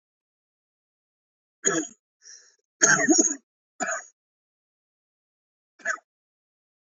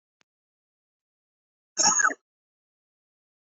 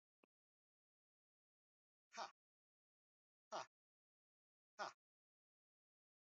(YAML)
three_cough_length: 7.0 s
three_cough_amplitude: 21224
three_cough_signal_mean_std_ratio: 0.28
cough_length: 3.6 s
cough_amplitude: 14509
cough_signal_mean_std_ratio: 0.24
exhalation_length: 6.3 s
exhalation_amplitude: 548
exhalation_signal_mean_std_ratio: 0.18
survey_phase: beta (2021-08-13 to 2022-03-07)
age: 18-44
gender: Male
wearing_mask: 'No'
symptom_cough_any: true
symptom_runny_or_blocked_nose: true
symptom_abdominal_pain: true
symptom_fatigue: true
symptom_fever_high_temperature: true
symptom_headache: true
symptom_change_to_sense_of_smell_or_taste: true
symptom_loss_of_taste: true
symptom_onset: 2 days
smoker_status: Never smoked
respiratory_condition_asthma: false
respiratory_condition_other: false
recruitment_source: Test and Trace
submission_delay: 1 day
covid_test_result: Positive
covid_test_method: ePCR